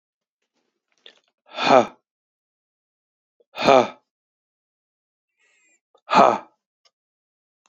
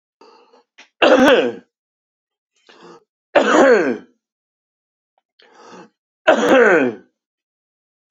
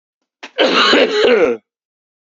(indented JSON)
{
  "exhalation_length": "7.7 s",
  "exhalation_amplitude": 31281,
  "exhalation_signal_mean_std_ratio": 0.23,
  "three_cough_length": "8.1 s",
  "three_cough_amplitude": 32768,
  "three_cough_signal_mean_std_ratio": 0.38,
  "cough_length": "2.4 s",
  "cough_amplitude": 32767,
  "cough_signal_mean_std_ratio": 0.58,
  "survey_phase": "beta (2021-08-13 to 2022-03-07)",
  "age": "18-44",
  "gender": "Male",
  "wearing_mask": "No",
  "symptom_cough_any": true,
  "symptom_runny_or_blocked_nose": true,
  "symptom_sore_throat": true,
  "symptom_abdominal_pain": true,
  "symptom_fatigue": true,
  "symptom_fever_high_temperature": true,
  "symptom_headache": true,
  "symptom_change_to_sense_of_smell_or_taste": true,
  "symptom_onset": "3 days",
  "smoker_status": "Never smoked",
  "respiratory_condition_asthma": false,
  "respiratory_condition_other": false,
  "recruitment_source": "Test and Trace",
  "submission_delay": "2 days",
  "covid_test_result": "Positive",
  "covid_test_method": "RT-qPCR"
}